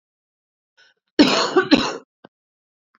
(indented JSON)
{
  "cough_length": "3.0 s",
  "cough_amplitude": 28200,
  "cough_signal_mean_std_ratio": 0.34,
  "survey_phase": "beta (2021-08-13 to 2022-03-07)",
  "age": "18-44",
  "gender": "Female",
  "wearing_mask": "No",
  "symptom_cough_any": true,
  "symptom_runny_or_blocked_nose": true,
  "symptom_sore_throat": true,
  "symptom_onset": "6 days",
  "smoker_status": "Prefer not to say",
  "respiratory_condition_asthma": false,
  "respiratory_condition_other": false,
  "recruitment_source": "REACT",
  "submission_delay": "1 day",
  "covid_test_result": "Negative",
  "covid_test_method": "RT-qPCR",
  "influenza_a_test_result": "Negative",
  "influenza_b_test_result": "Negative"
}